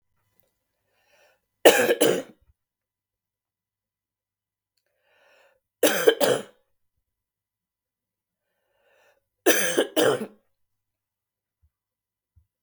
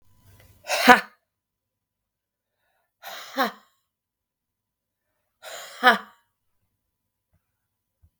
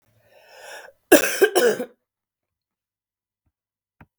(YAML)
three_cough_length: 12.6 s
three_cough_amplitude: 32768
three_cough_signal_mean_std_ratio: 0.26
exhalation_length: 8.2 s
exhalation_amplitude: 32768
exhalation_signal_mean_std_ratio: 0.19
cough_length: 4.2 s
cough_amplitude: 32768
cough_signal_mean_std_ratio: 0.28
survey_phase: beta (2021-08-13 to 2022-03-07)
age: 45-64
gender: Female
wearing_mask: 'No'
symptom_cough_any: true
symptom_runny_or_blocked_nose: true
symptom_fatigue: true
symptom_headache: true
symptom_onset: 5 days
smoker_status: Never smoked
respiratory_condition_asthma: false
respiratory_condition_other: false
recruitment_source: Test and Trace
submission_delay: 2 days
covid_test_result: Positive
covid_test_method: RT-qPCR
covid_ct_value: 24.9
covid_ct_gene: ORF1ab gene
covid_ct_mean: 25.5
covid_viral_load: 4300 copies/ml
covid_viral_load_category: Minimal viral load (< 10K copies/ml)